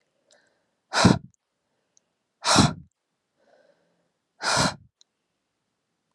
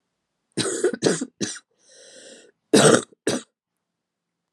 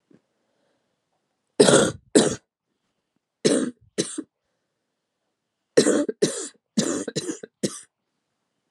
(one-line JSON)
{"exhalation_length": "6.1 s", "exhalation_amplitude": 24522, "exhalation_signal_mean_std_ratio": 0.27, "cough_length": "4.5 s", "cough_amplitude": 30036, "cough_signal_mean_std_ratio": 0.35, "three_cough_length": "8.7 s", "three_cough_amplitude": 30188, "three_cough_signal_mean_std_ratio": 0.33, "survey_phase": "alpha (2021-03-01 to 2021-08-12)", "age": "45-64", "gender": "Female", "wearing_mask": "No", "symptom_cough_any": true, "symptom_abdominal_pain": true, "symptom_diarrhoea": true, "symptom_fatigue": true, "symptom_headache": true, "symptom_onset": "3 days", "smoker_status": "Never smoked", "respiratory_condition_asthma": true, "respiratory_condition_other": false, "recruitment_source": "Test and Trace", "submission_delay": "2 days", "covid_test_result": "Positive", "covid_test_method": "RT-qPCR", "covid_ct_value": 14.0, "covid_ct_gene": "N gene", "covid_ct_mean": 14.3, "covid_viral_load": "20000000 copies/ml", "covid_viral_load_category": "High viral load (>1M copies/ml)"}